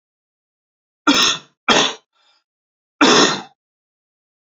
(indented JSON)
{
  "three_cough_length": "4.4 s",
  "three_cough_amplitude": 31661,
  "three_cough_signal_mean_std_ratio": 0.36,
  "survey_phase": "alpha (2021-03-01 to 2021-08-12)",
  "age": "45-64",
  "gender": "Male",
  "wearing_mask": "No",
  "symptom_none": true,
  "symptom_onset": "6 days",
  "smoker_status": "Never smoked",
  "respiratory_condition_asthma": false,
  "respiratory_condition_other": false,
  "recruitment_source": "REACT",
  "submission_delay": "2 days",
  "covid_test_result": "Negative",
  "covid_test_method": "RT-qPCR"
}